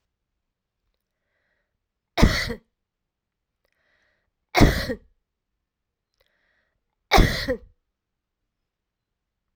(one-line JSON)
{"three_cough_length": "9.6 s", "three_cough_amplitude": 29094, "three_cough_signal_mean_std_ratio": 0.22, "survey_phase": "alpha (2021-03-01 to 2021-08-12)", "age": "45-64", "gender": "Female", "wearing_mask": "No", "symptom_cough_any": true, "symptom_abdominal_pain": true, "symptom_fever_high_temperature": true, "symptom_headache": true, "symptom_change_to_sense_of_smell_or_taste": true, "symptom_loss_of_taste": true, "symptom_onset": "7 days", "smoker_status": "Never smoked", "respiratory_condition_asthma": false, "respiratory_condition_other": false, "recruitment_source": "Test and Trace", "submission_delay": "1 day", "covid_test_result": "Positive", "covid_test_method": "RT-qPCR"}